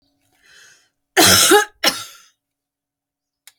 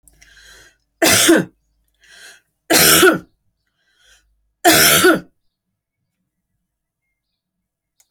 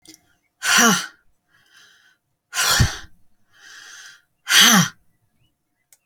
{"cough_length": "3.6 s", "cough_amplitude": 32768, "cough_signal_mean_std_ratio": 0.34, "three_cough_length": "8.1 s", "three_cough_amplitude": 32768, "three_cough_signal_mean_std_ratio": 0.35, "exhalation_length": "6.1 s", "exhalation_amplitude": 32767, "exhalation_signal_mean_std_ratio": 0.36, "survey_phase": "alpha (2021-03-01 to 2021-08-12)", "age": "65+", "gender": "Female", "wearing_mask": "No", "symptom_none": true, "smoker_status": "Ex-smoker", "respiratory_condition_asthma": false, "respiratory_condition_other": false, "recruitment_source": "REACT", "submission_delay": "2 days", "covid_test_result": "Negative", "covid_test_method": "RT-qPCR"}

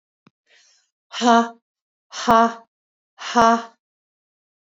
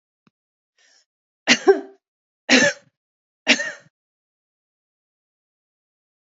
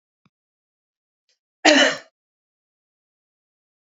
{"exhalation_length": "4.8 s", "exhalation_amplitude": 28382, "exhalation_signal_mean_std_ratio": 0.31, "three_cough_length": "6.2 s", "three_cough_amplitude": 30754, "three_cough_signal_mean_std_ratio": 0.24, "cough_length": "3.9 s", "cough_amplitude": 32214, "cough_signal_mean_std_ratio": 0.21, "survey_phase": "alpha (2021-03-01 to 2021-08-12)", "age": "45-64", "gender": "Female", "wearing_mask": "No", "symptom_none": true, "smoker_status": "Never smoked", "respiratory_condition_asthma": false, "respiratory_condition_other": false, "recruitment_source": "REACT", "submission_delay": "1 day", "covid_test_result": "Negative", "covid_test_method": "RT-qPCR"}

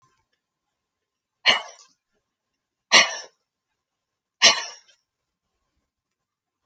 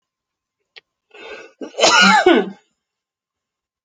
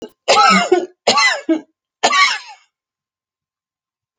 {"exhalation_length": "6.7 s", "exhalation_amplitude": 32768, "exhalation_signal_mean_std_ratio": 0.2, "cough_length": "3.8 s", "cough_amplitude": 32768, "cough_signal_mean_std_ratio": 0.36, "three_cough_length": "4.2 s", "three_cough_amplitude": 30819, "three_cough_signal_mean_std_ratio": 0.47, "survey_phase": "alpha (2021-03-01 to 2021-08-12)", "age": "45-64", "gender": "Female", "wearing_mask": "No", "symptom_none": true, "smoker_status": "Ex-smoker", "respiratory_condition_asthma": false, "respiratory_condition_other": true, "recruitment_source": "REACT", "submission_delay": "2 days", "covid_test_result": "Negative", "covid_test_method": "RT-qPCR"}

